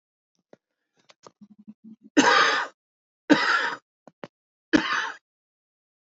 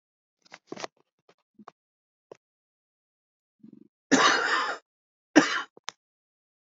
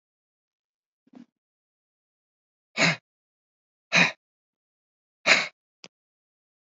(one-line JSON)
{"three_cough_length": "6.1 s", "three_cough_amplitude": 20255, "three_cough_signal_mean_std_ratio": 0.35, "cough_length": "6.7 s", "cough_amplitude": 22599, "cough_signal_mean_std_ratio": 0.27, "exhalation_length": "6.7 s", "exhalation_amplitude": 19734, "exhalation_signal_mean_std_ratio": 0.21, "survey_phase": "alpha (2021-03-01 to 2021-08-12)", "age": "45-64", "gender": "Female", "wearing_mask": "No", "symptom_none": true, "smoker_status": "Current smoker (11 or more cigarettes per day)", "respiratory_condition_asthma": false, "respiratory_condition_other": false, "recruitment_source": "REACT", "submission_delay": "2 days", "covid_test_result": "Negative", "covid_test_method": "RT-qPCR"}